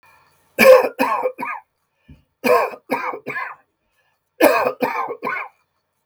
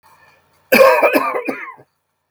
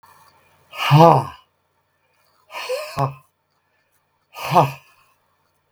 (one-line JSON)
{"three_cough_length": "6.1 s", "three_cough_amplitude": 32766, "three_cough_signal_mean_std_ratio": 0.42, "cough_length": "2.3 s", "cough_amplitude": 32768, "cough_signal_mean_std_ratio": 0.46, "exhalation_length": "5.7 s", "exhalation_amplitude": 32766, "exhalation_signal_mean_std_ratio": 0.31, "survey_phase": "beta (2021-08-13 to 2022-03-07)", "age": "65+", "gender": "Male", "wearing_mask": "No", "symptom_cough_any": true, "smoker_status": "Ex-smoker", "respiratory_condition_asthma": false, "respiratory_condition_other": true, "recruitment_source": "REACT", "submission_delay": "3 days", "covid_test_result": "Negative", "covid_test_method": "RT-qPCR"}